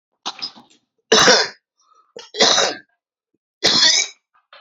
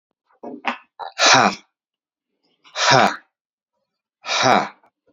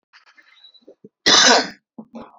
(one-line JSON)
{"three_cough_length": "4.6 s", "three_cough_amplitude": 32140, "three_cough_signal_mean_std_ratio": 0.42, "exhalation_length": "5.1 s", "exhalation_amplitude": 31980, "exhalation_signal_mean_std_ratio": 0.38, "cough_length": "2.4 s", "cough_amplitude": 29192, "cough_signal_mean_std_ratio": 0.35, "survey_phase": "alpha (2021-03-01 to 2021-08-12)", "age": "45-64", "gender": "Male", "wearing_mask": "No", "symptom_cough_any": true, "symptom_onset": "12 days", "smoker_status": "Ex-smoker", "respiratory_condition_asthma": false, "respiratory_condition_other": false, "recruitment_source": "REACT", "submission_delay": "2 days", "covid_test_result": "Negative", "covid_test_method": "RT-qPCR"}